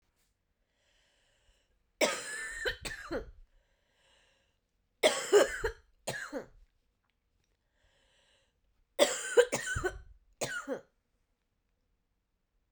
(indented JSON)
{
  "three_cough_length": "12.7 s",
  "three_cough_amplitude": 10202,
  "three_cough_signal_mean_std_ratio": 0.3,
  "survey_phase": "beta (2021-08-13 to 2022-03-07)",
  "age": "45-64",
  "gender": "Female",
  "wearing_mask": "No",
  "symptom_cough_any": true,
  "symptom_new_continuous_cough": true,
  "symptom_runny_or_blocked_nose": true,
  "symptom_sore_throat": true,
  "symptom_fatigue": true,
  "symptom_headache": true,
  "symptom_other": true,
  "smoker_status": "Never smoked",
  "respiratory_condition_asthma": false,
  "respiratory_condition_other": false,
  "recruitment_source": "Test and Trace",
  "submission_delay": "1 day",
  "covid_test_result": "Positive",
  "covid_test_method": "RT-qPCR",
  "covid_ct_value": 27.3,
  "covid_ct_gene": "ORF1ab gene",
  "covid_ct_mean": 28.0,
  "covid_viral_load": "660 copies/ml",
  "covid_viral_load_category": "Minimal viral load (< 10K copies/ml)"
}